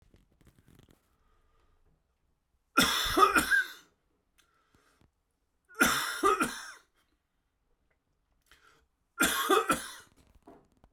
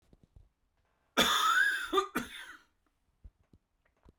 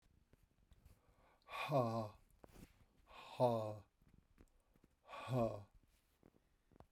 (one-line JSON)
{"three_cough_length": "10.9 s", "three_cough_amplitude": 10969, "three_cough_signal_mean_std_ratio": 0.35, "cough_length": "4.2 s", "cough_amplitude": 7559, "cough_signal_mean_std_ratio": 0.41, "exhalation_length": "6.9 s", "exhalation_amplitude": 2229, "exhalation_signal_mean_std_ratio": 0.37, "survey_phase": "beta (2021-08-13 to 2022-03-07)", "age": "45-64", "gender": "Male", "wearing_mask": "No", "symptom_cough_any": true, "symptom_new_continuous_cough": true, "symptom_runny_or_blocked_nose": true, "symptom_shortness_of_breath": true, "symptom_abdominal_pain": true, "symptom_diarrhoea": true, "symptom_fatigue": true, "symptom_fever_high_temperature": true, "symptom_headache": true, "symptom_change_to_sense_of_smell_or_taste": true, "symptom_other": true, "symptom_onset": "3 days", "smoker_status": "Never smoked", "respiratory_condition_asthma": false, "respiratory_condition_other": false, "recruitment_source": "Test and Trace", "submission_delay": "1 day", "covid_test_result": "Positive", "covid_test_method": "RT-qPCR"}